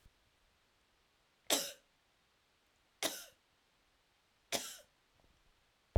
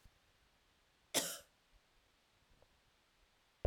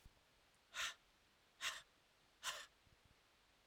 {"three_cough_length": "6.0 s", "three_cough_amplitude": 4890, "three_cough_signal_mean_std_ratio": 0.22, "cough_length": "3.7 s", "cough_amplitude": 3496, "cough_signal_mean_std_ratio": 0.22, "exhalation_length": "3.7 s", "exhalation_amplitude": 822, "exhalation_signal_mean_std_ratio": 0.38, "survey_phase": "beta (2021-08-13 to 2022-03-07)", "age": "45-64", "gender": "Female", "wearing_mask": "No", "symptom_none": true, "smoker_status": "Never smoked", "respiratory_condition_asthma": false, "respiratory_condition_other": false, "recruitment_source": "REACT", "submission_delay": "1 day", "covid_test_result": "Negative", "covid_test_method": "RT-qPCR"}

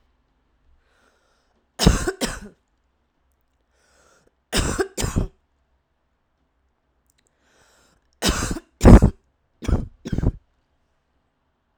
{"three_cough_length": "11.8 s", "three_cough_amplitude": 32768, "three_cough_signal_mean_std_ratio": 0.25, "survey_phase": "beta (2021-08-13 to 2022-03-07)", "age": "18-44", "gender": "Female", "wearing_mask": "No", "symptom_runny_or_blocked_nose": true, "symptom_fatigue": true, "symptom_headache": true, "symptom_change_to_sense_of_smell_or_taste": true, "symptom_loss_of_taste": true, "smoker_status": "Current smoker (11 or more cigarettes per day)", "respiratory_condition_asthma": false, "respiratory_condition_other": false, "recruitment_source": "Test and Trace", "submission_delay": "3 days", "covid_test_result": "Positive", "covid_test_method": "RT-qPCR", "covid_ct_value": 28.9, "covid_ct_gene": "ORF1ab gene"}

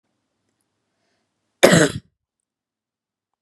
{"cough_length": "3.4 s", "cough_amplitude": 32768, "cough_signal_mean_std_ratio": 0.22, "survey_phase": "beta (2021-08-13 to 2022-03-07)", "age": "18-44", "gender": "Female", "wearing_mask": "No", "symptom_none": true, "smoker_status": "Never smoked", "respiratory_condition_asthma": false, "respiratory_condition_other": false, "recruitment_source": "REACT", "submission_delay": "5 days", "covid_test_result": "Negative", "covid_test_method": "RT-qPCR"}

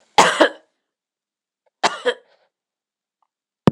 {"cough_length": "3.7 s", "cough_amplitude": 26028, "cough_signal_mean_std_ratio": 0.26, "survey_phase": "beta (2021-08-13 to 2022-03-07)", "age": "45-64", "gender": "Female", "wearing_mask": "No", "symptom_none": true, "smoker_status": "Never smoked", "respiratory_condition_asthma": false, "respiratory_condition_other": false, "recruitment_source": "REACT", "submission_delay": "1 day", "covid_test_result": "Negative", "covid_test_method": "RT-qPCR"}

